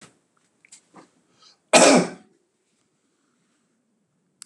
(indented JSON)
{
  "cough_length": "4.5 s",
  "cough_amplitude": 29965,
  "cough_signal_mean_std_ratio": 0.22,
  "survey_phase": "beta (2021-08-13 to 2022-03-07)",
  "age": "65+",
  "gender": "Male",
  "wearing_mask": "No",
  "symptom_runny_or_blocked_nose": true,
  "symptom_fatigue": true,
  "symptom_other": true,
  "smoker_status": "Never smoked",
  "respiratory_condition_asthma": false,
  "respiratory_condition_other": false,
  "recruitment_source": "REACT",
  "submission_delay": "2 days",
  "covid_test_result": "Negative",
  "covid_test_method": "RT-qPCR",
  "influenza_a_test_result": "Negative",
  "influenza_b_test_result": "Negative"
}